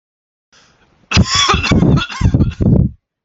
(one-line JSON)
{"cough_length": "3.2 s", "cough_amplitude": 31670, "cough_signal_mean_std_ratio": 0.6, "survey_phase": "alpha (2021-03-01 to 2021-08-12)", "age": "18-44", "gender": "Male", "wearing_mask": "No", "symptom_none": true, "smoker_status": "Ex-smoker", "respiratory_condition_asthma": false, "respiratory_condition_other": false, "recruitment_source": "REACT", "submission_delay": "2 days", "covid_test_result": "Negative", "covid_test_method": "RT-qPCR"}